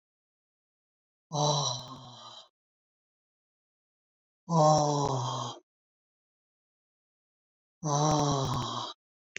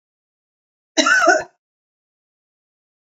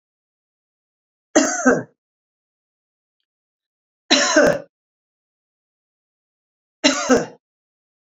{"exhalation_length": "9.4 s", "exhalation_amplitude": 9739, "exhalation_signal_mean_std_ratio": 0.41, "cough_length": "3.1 s", "cough_amplitude": 28569, "cough_signal_mean_std_ratio": 0.31, "three_cough_length": "8.1 s", "three_cough_amplitude": 31363, "three_cough_signal_mean_std_ratio": 0.29, "survey_phase": "beta (2021-08-13 to 2022-03-07)", "age": "65+", "gender": "Female", "wearing_mask": "No", "symptom_none": true, "smoker_status": "Ex-smoker", "respiratory_condition_asthma": false, "respiratory_condition_other": false, "recruitment_source": "REACT", "submission_delay": "17 days", "covid_test_result": "Negative", "covid_test_method": "RT-qPCR", "influenza_a_test_result": "Negative", "influenza_b_test_result": "Negative"}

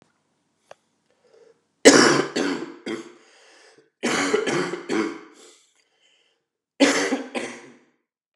{"three_cough_length": "8.4 s", "three_cough_amplitude": 32768, "three_cough_signal_mean_std_ratio": 0.37, "survey_phase": "beta (2021-08-13 to 2022-03-07)", "age": "45-64", "gender": "Male", "wearing_mask": "No", "symptom_cough_any": true, "symptom_new_continuous_cough": true, "symptom_runny_or_blocked_nose": true, "symptom_sore_throat": true, "symptom_other": true, "symptom_onset": "4 days", "smoker_status": "Ex-smoker", "respiratory_condition_asthma": false, "respiratory_condition_other": false, "recruitment_source": "Test and Trace", "submission_delay": "2 days", "covid_test_result": "Positive", "covid_test_method": "RT-qPCR", "covid_ct_value": 15.2, "covid_ct_gene": "S gene", "covid_ct_mean": 15.6, "covid_viral_load": "7800000 copies/ml", "covid_viral_load_category": "High viral load (>1M copies/ml)"}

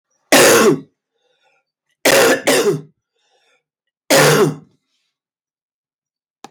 {"three_cough_length": "6.5 s", "three_cough_amplitude": 32768, "three_cough_signal_mean_std_ratio": 0.41, "survey_phase": "beta (2021-08-13 to 2022-03-07)", "age": "45-64", "gender": "Male", "wearing_mask": "No", "symptom_cough_any": true, "symptom_runny_or_blocked_nose": true, "symptom_sore_throat": true, "symptom_fatigue": true, "smoker_status": "Never smoked", "respiratory_condition_asthma": false, "respiratory_condition_other": false, "recruitment_source": "Test and Trace", "submission_delay": "1 day", "covid_test_result": "Positive", "covid_test_method": "RT-qPCR", "covid_ct_value": 19.8, "covid_ct_gene": "N gene"}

